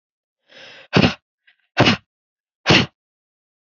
{"exhalation_length": "3.7 s", "exhalation_amplitude": 31782, "exhalation_signal_mean_std_ratio": 0.3, "survey_phase": "beta (2021-08-13 to 2022-03-07)", "age": "18-44", "gender": "Female", "wearing_mask": "No", "symptom_none": true, "smoker_status": "Never smoked", "respiratory_condition_asthma": false, "respiratory_condition_other": false, "recruitment_source": "REACT", "submission_delay": "1 day", "covid_test_result": "Negative", "covid_test_method": "RT-qPCR"}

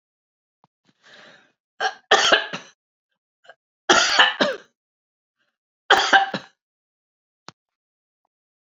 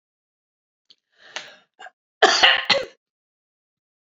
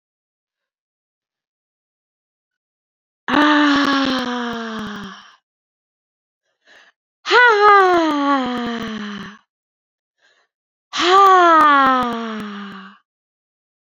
{"three_cough_length": "8.8 s", "three_cough_amplitude": 28809, "three_cough_signal_mean_std_ratio": 0.3, "cough_length": "4.2 s", "cough_amplitude": 29940, "cough_signal_mean_std_ratio": 0.28, "exhalation_length": "14.0 s", "exhalation_amplitude": 27991, "exhalation_signal_mean_std_ratio": 0.46, "survey_phase": "beta (2021-08-13 to 2022-03-07)", "age": "65+", "gender": "Female", "wearing_mask": "No", "symptom_none": true, "smoker_status": "Ex-smoker", "respiratory_condition_asthma": false, "respiratory_condition_other": true, "recruitment_source": "REACT", "submission_delay": "2 days", "covid_test_result": "Negative", "covid_test_method": "RT-qPCR", "influenza_a_test_result": "Negative", "influenza_b_test_result": "Negative"}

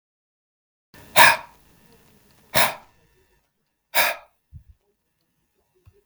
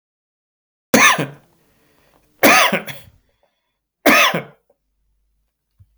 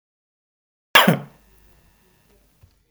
{"exhalation_length": "6.1 s", "exhalation_amplitude": 32768, "exhalation_signal_mean_std_ratio": 0.23, "three_cough_length": "6.0 s", "three_cough_amplitude": 32766, "three_cough_signal_mean_std_ratio": 0.34, "cough_length": "2.9 s", "cough_amplitude": 32768, "cough_signal_mean_std_ratio": 0.21, "survey_phase": "beta (2021-08-13 to 2022-03-07)", "age": "65+", "gender": "Male", "wearing_mask": "No", "symptom_abdominal_pain": true, "symptom_fatigue": true, "symptom_onset": "13 days", "smoker_status": "Ex-smoker", "respiratory_condition_asthma": false, "respiratory_condition_other": false, "recruitment_source": "REACT", "submission_delay": "1 day", "covid_test_result": "Negative", "covid_test_method": "RT-qPCR", "influenza_a_test_result": "Unknown/Void", "influenza_b_test_result": "Unknown/Void"}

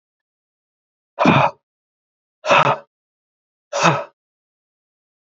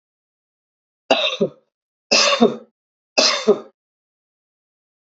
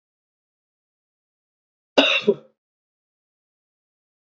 {"exhalation_length": "5.2 s", "exhalation_amplitude": 30655, "exhalation_signal_mean_std_ratio": 0.32, "three_cough_length": "5.0 s", "three_cough_amplitude": 28516, "three_cough_signal_mean_std_ratio": 0.36, "cough_length": "4.3 s", "cough_amplitude": 27772, "cough_signal_mean_std_ratio": 0.2, "survey_phase": "beta (2021-08-13 to 2022-03-07)", "age": "45-64", "gender": "Male", "wearing_mask": "No", "symptom_none": true, "smoker_status": "Never smoked", "respiratory_condition_asthma": false, "respiratory_condition_other": false, "recruitment_source": "REACT", "submission_delay": "1 day", "covid_test_result": "Negative", "covid_test_method": "RT-qPCR", "influenza_a_test_result": "Negative", "influenza_b_test_result": "Negative"}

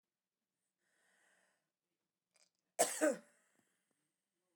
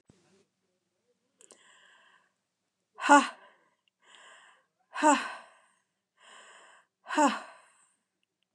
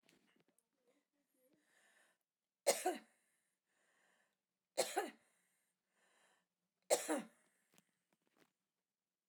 {"cough_length": "4.6 s", "cough_amplitude": 4138, "cough_signal_mean_std_ratio": 0.2, "exhalation_length": "8.5 s", "exhalation_amplitude": 17481, "exhalation_signal_mean_std_ratio": 0.22, "three_cough_length": "9.3 s", "three_cough_amplitude": 3381, "three_cough_signal_mean_std_ratio": 0.22, "survey_phase": "alpha (2021-03-01 to 2021-08-12)", "age": "65+", "gender": "Female", "wearing_mask": "No", "symptom_none": true, "smoker_status": "Ex-smoker", "respiratory_condition_asthma": false, "respiratory_condition_other": false, "recruitment_source": "REACT", "submission_delay": "2 days", "covid_test_result": "Negative", "covid_test_method": "RT-qPCR"}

